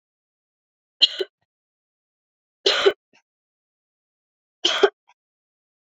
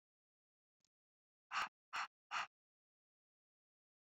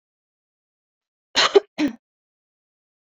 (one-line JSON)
{"three_cough_length": "6.0 s", "three_cough_amplitude": 28463, "three_cough_signal_mean_std_ratio": 0.22, "exhalation_length": "4.0 s", "exhalation_amplitude": 1133, "exhalation_signal_mean_std_ratio": 0.25, "cough_length": "3.1 s", "cough_amplitude": 25200, "cough_signal_mean_std_ratio": 0.22, "survey_phase": "beta (2021-08-13 to 2022-03-07)", "age": "18-44", "gender": "Female", "wearing_mask": "No", "symptom_cough_any": true, "symptom_runny_or_blocked_nose": true, "symptom_fatigue": true, "symptom_fever_high_temperature": true, "symptom_change_to_sense_of_smell_or_taste": true, "symptom_onset": "3 days", "smoker_status": "Never smoked", "respiratory_condition_asthma": false, "respiratory_condition_other": false, "recruitment_source": "Test and Trace", "submission_delay": "2 days", "covid_test_result": "Positive", "covid_test_method": "RT-qPCR", "covid_ct_value": 20.7, "covid_ct_gene": "ORF1ab gene"}